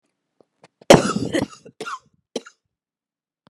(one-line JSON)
{"cough_length": "3.5 s", "cough_amplitude": 32768, "cough_signal_mean_std_ratio": 0.24, "survey_phase": "beta (2021-08-13 to 2022-03-07)", "age": "45-64", "gender": "Female", "wearing_mask": "No", "symptom_cough_any": true, "symptom_shortness_of_breath": true, "symptom_fatigue": true, "symptom_headache": true, "symptom_change_to_sense_of_smell_or_taste": true, "symptom_onset": "4 days", "smoker_status": "Ex-smoker", "respiratory_condition_asthma": false, "respiratory_condition_other": false, "recruitment_source": "Test and Trace", "submission_delay": "1 day", "covid_test_result": "Positive", "covid_test_method": "ePCR"}